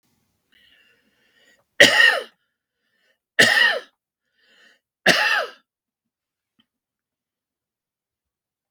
{
  "three_cough_length": "8.7 s",
  "three_cough_amplitude": 32768,
  "three_cough_signal_mean_std_ratio": 0.28,
  "survey_phase": "beta (2021-08-13 to 2022-03-07)",
  "age": "65+",
  "gender": "Male",
  "wearing_mask": "No",
  "symptom_none": true,
  "smoker_status": "Never smoked",
  "respiratory_condition_asthma": false,
  "respiratory_condition_other": false,
  "recruitment_source": "REACT",
  "submission_delay": "2 days",
  "covid_test_result": "Negative",
  "covid_test_method": "RT-qPCR",
  "influenza_a_test_result": "Negative",
  "influenza_b_test_result": "Negative"
}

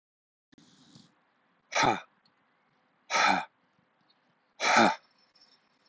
{
  "exhalation_length": "5.9 s",
  "exhalation_amplitude": 10563,
  "exhalation_signal_mean_std_ratio": 0.31,
  "survey_phase": "alpha (2021-03-01 to 2021-08-12)",
  "age": "45-64",
  "gender": "Male",
  "wearing_mask": "No",
  "symptom_none": true,
  "smoker_status": "Never smoked",
  "respiratory_condition_asthma": false,
  "respiratory_condition_other": false,
  "recruitment_source": "REACT",
  "submission_delay": "2 days",
  "covid_test_result": "Negative",
  "covid_test_method": "RT-qPCR"
}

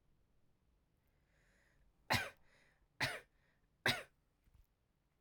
{
  "three_cough_length": "5.2 s",
  "three_cough_amplitude": 2514,
  "three_cough_signal_mean_std_ratio": 0.25,
  "survey_phase": "beta (2021-08-13 to 2022-03-07)",
  "age": "18-44",
  "gender": "Female",
  "wearing_mask": "No",
  "symptom_runny_or_blocked_nose": true,
  "symptom_change_to_sense_of_smell_or_taste": true,
  "symptom_loss_of_taste": true,
  "symptom_onset": "2 days",
  "smoker_status": "Never smoked",
  "respiratory_condition_asthma": false,
  "respiratory_condition_other": false,
  "recruitment_source": "Test and Trace",
  "submission_delay": "2 days",
  "covid_test_result": "Positive",
  "covid_test_method": "RT-qPCR",
  "covid_ct_value": 15.6,
  "covid_ct_gene": "ORF1ab gene",
  "covid_ct_mean": 15.9,
  "covid_viral_load": "6200000 copies/ml",
  "covid_viral_load_category": "High viral load (>1M copies/ml)"
}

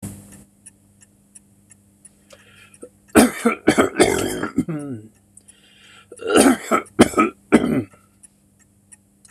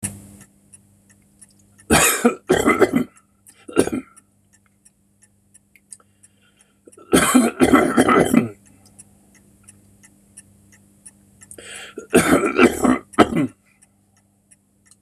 {
  "cough_length": "9.3 s",
  "cough_amplitude": 26028,
  "cough_signal_mean_std_ratio": 0.37,
  "three_cough_length": "15.0 s",
  "three_cough_amplitude": 26028,
  "three_cough_signal_mean_std_ratio": 0.38,
  "survey_phase": "beta (2021-08-13 to 2022-03-07)",
  "age": "65+",
  "gender": "Male",
  "wearing_mask": "No",
  "symptom_none": true,
  "smoker_status": "Never smoked",
  "respiratory_condition_asthma": false,
  "respiratory_condition_other": false,
  "recruitment_source": "REACT",
  "submission_delay": "1 day",
  "covid_test_result": "Negative",
  "covid_test_method": "RT-qPCR",
  "influenza_a_test_result": "Unknown/Void",
  "influenza_b_test_result": "Unknown/Void"
}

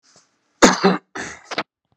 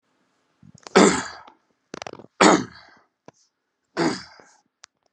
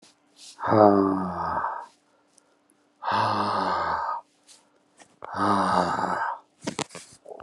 {
  "cough_length": "2.0 s",
  "cough_amplitude": 32768,
  "cough_signal_mean_std_ratio": 0.33,
  "three_cough_length": "5.1 s",
  "three_cough_amplitude": 32513,
  "three_cough_signal_mean_std_ratio": 0.28,
  "exhalation_length": "7.4 s",
  "exhalation_amplitude": 24535,
  "exhalation_signal_mean_std_ratio": 0.54,
  "survey_phase": "beta (2021-08-13 to 2022-03-07)",
  "age": "45-64",
  "gender": "Male",
  "wearing_mask": "No",
  "symptom_cough_any": true,
  "symptom_shortness_of_breath": true,
  "symptom_fatigue": true,
  "symptom_headache": true,
  "smoker_status": "Ex-smoker",
  "respiratory_condition_asthma": false,
  "respiratory_condition_other": false,
  "recruitment_source": "Test and Trace",
  "submission_delay": "2 days",
  "covid_test_result": "Positive",
  "covid_test_method": "RT-qPCR",
  "covid_ct_value": 20.3,
  "covid_ct_gene": "ORF1ab gene",
  "covid_ct_mean": 20.6,
  "covid_viral_load": "180000 copies/ml",
  "covid_viral_load_category": "Low viral load (10K-1M copies/ml)"
}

